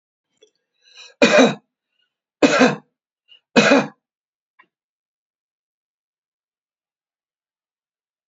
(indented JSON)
{
  "three_cough_length": "8.3 s",
  "three_cough_amplitude": 32349,
  "three_cough_signal_mean_std_ratio": 0.26,
  "survey_phase": "beta (2021-08-13 to 2022-03-07)",
  "age": "65+",
  "gender": "Male",
  "wearing_mask": "No",
  "symptom_none": true,
  "smoker_status": "Ex-smoker",
  "respiratory_condition_asthma": false,
  "respiratory_condition_other": false,
  "recruitment_source": "REACT",
  "submission_delay": "2 days",
  "covid_test_result": "Negative",
  "covid_test_method": "RT-qPCR"
}